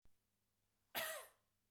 {"cough_length": "1.7 s", "cough_amplitude": 1259, "cough_signal_mean_std_ratio": 0.36, "survey_phase": "beta (2021-08-13 to 2022-03-07)", "age": "18-44", "gender": "Female", "wearing_mask": "No", "symptom_none": true, "smoker_status": "Ex-smoker", "respiratory_condition_asthma": false, "respiratory_condition_other": false, "recruitment_source": "REACT", "submission_delay": "2 days", "covid_test_result": "Negative", "covid_test_method": "RT-qPCR", "influenza_a_test_result": "Unknown/Void", "influenza_b_test_result": "Unknown/Void"}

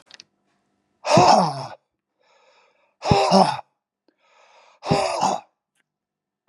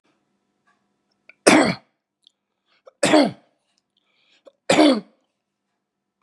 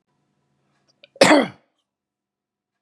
{"exhalation_length": "6.5 s", "exhalation_amplitude": 26909, "exhalation_signal_mean_std_ratio": 0.37, "three_cough_length": "6.2 s", "three_cough_amplitude": 32768, "three_cough_signal_mean_std_ratio": 0.29, "cough_length": "2.8 s", "cough_amplitude": 32558, "cough_signal_mean_std_ratio": 0.23, "survey_phase": "beta (2021-08-13 to 2022-03-07)", "age": "65+", "gender": "Male", "wearing_mask": "No", "symptom_runny_or_blocked_nose": true, "smoker_status": "Ex-smoker", "respiratory_condition_asthma": false, "respiratory_condition_other": false, "recruitment_source": "REACT", "submission_delay": "1 day", "covid_test_result": "Negative", "covid_test_method": "RT-qPCR"}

